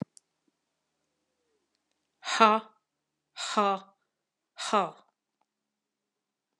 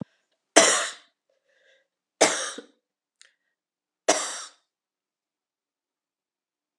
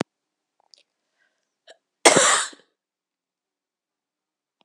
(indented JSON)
{
  "exhalation_length": "6.6 s",
  "exhalation_amplitude": 18573,
  "exhalation_signal_mean_std_ratio": 0.24,
  "three_cough_length": "6.8 s",
  "three_cough_amplitude": 30691,
  "three_cough_signal_mean_std_ratio": 0.24,
  "cough_length": "4.6 s",
  "cough_amplitude": 32768,
  "cough_signal_mean_std_ratio": 0.22,
  "survey_phase": "beta (2021-08-13 to 2022-03-07)",
  "age": "65+",
  "gender": "Female",
  "wearing_mask": "No",
  "symptom_cough_any": true,
  "symptom_new_continuous_cough": true,
  "symptom_runny_or_blocked_nose": true,
  "symptom_shortness_of_breath": true,
  "symptom_fatigue": true,
  "symptom_headache": true,
  "symptom_change_to_sense_of_smell_or_taste": true,
  "symptom_loss_of_taste": true,
  "symptom_onset": "7 days",
  "smoker_status": "Ex-smoker",
  "respiratory_condition_asthma": false,
  "respiratory_condition_other": false,
  "recruitment_source": "Test and Trace",
  "submission_delay": "1 day",
  "covid_test_result": "Positive",
  "covid_test_method": "RT-qPCR"
}